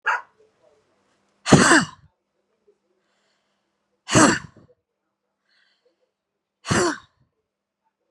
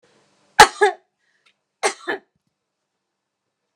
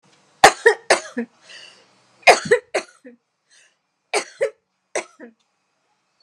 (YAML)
exhalation_length: 8.1 s
exhalation_amplitude: 32767
exhalation_signal_mean_std_ratio: 0.27
cough_length: 3.8 s
cough_amplitude: 32768
cough_signal_mean_std_ratio: 0.2
three_cough_length: 6.2 s
three_cough_amplitude: 32768
three_cough_signal_mean_std_ratio: 0.26
survey_phase: beta (2021-08-13 to 2022-03-07)
age: 45-64
gender: Female
wearing_mask: 'No'
symptom_shortness_of_breath: true
symptom_onset: 8 days
smoker_status: Ex-smoker
respiratory_condition_asthma: false
respiratory_condition_other: false
recruitment_source: REACT
submission_delay: 7 days
covid_test_result: Negative
covid_test_method: RT-qPCR